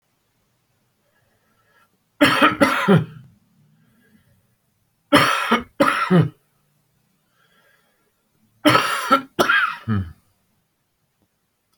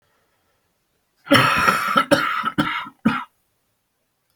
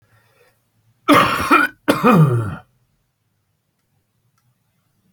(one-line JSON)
{"three_cough_length": "11.8 s", "three_cough_amplitude": 32082, "three_cough_signal_mean_std_ratio": 0.37, "cough_length": "4.4 s", "cough_amplitude": 28680, "cough_signal_mean_std_ratio": 0.46, "exhalation_length": "5.1 s", "exhalation_amplitude": 29794, "exhalation_signal_mean_std_ratio": 0.38, "survey_phase": "beta (2021-08-13 to 2022-03-07)", "age": "65+", "gender": "Male", "wearing_mask": "No", "symptom_cough_any": true, "symptom_runny_or_blocked_nose": true, "symptom_sore_throat": true, "symptom_fatigue": true, "symptom_fever_high_temperature": true, "symptom_loss_of_taste": true, "smoker_status": "Current smoker (1 to 10 cigarettes per day)", "respiratory_condition_asthma": false, "respiratory_condition_other": false, "recruitment_source": "Test and Trace", "submission_delay": "2 days", "covid_test_result": "Positive", "covid_test_method": "RT-qPCR", "covid_ct_value": 21.6, "covid_ct_gene": "ORF1ab gene"}